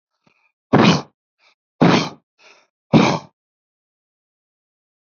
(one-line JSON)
{"exhalation_length": "5.0 s", "exhalation_amplitude": 32761, "exhalation_signal_mean_std_ratio": 0.31, "survey_phase": "beta (2021-08-13 to 2022-03-07)", "age": "45-64", "gender": "Male", "wearing_mask": "No", "symptom_cough_any": true, "symptom_shortness_of_breath": true, "symptom_sore_throat": true, "symptom_abdominal_pain": true, "symptom_headache": true, "symptom_change_to_sense_of_smell_or_taste": true, "symptom_other": true, "symptom_onset": "9 days", "smoker_status": "Ex-smoker", "respiratory_condition_asthma": true, "respiratory_condition_other": false, "recruitment_source": "REACT", "submission_delay": "2 days", "covid_test_result": "Negative", "covid_test_method": "RT-qPCR", "influenza_a_test_result": "Negative", "influenza_b_test_result": "Negative"}